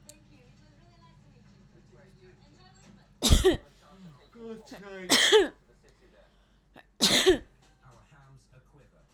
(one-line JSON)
{"three_cough_length": "9.1 s", "three_cough_amplitude": 16319, "three_cough_signal_mean_std_ratio": 0.31, "survey_phase": "alpha (2021-03-01 to 2021-08-12)", "age": "18-44", "gender": "Female", "wearing_mask": "No", "symptom_none": true, "smoker_status": "Never smoked", "respiratory_condition_asthma": true, "respiratory_condition_other": false, "recruitment_source": "REACT", "submission_delay": "4 days", "covid_test_result": "Negative", "covid_test_method": "RT-qPCR"}